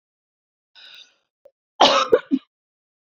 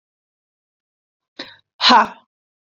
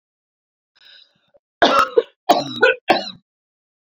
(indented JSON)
{
  "cough_length": "3.2 s",
  "cough_amplitude": 27527,
  "cough_signal_mean_std_ratio": 0.28,
  "exhalation_length": "2.6 s",
  "exhalation_amplitude": 31081,
  "exhalation_signal_mean_std_ratio": 0.26,
  "three_cough_length": "3.8 s",
  "three_cough_amplitude": 30124,
  "three_cough_signal_mean_std_ratio": 0.35,
  "survey_phase": "beta (2021-08-13 to 2022-03-07)",
  "age": "18-44",
  "gender": "Female",
  "wearing_mask": "No",
  "symptom_none": true,
  "smoker_status": "Ex-smoker",
  "respiratory_condition_asthma": false,
  "respiratory_condition_other": false,
  "recruitment_source": "REACT",
  "submission_delay": "1 day",
  "covid_test_result": "Negative",
  "covid_test_method": "RT-qPCR"
}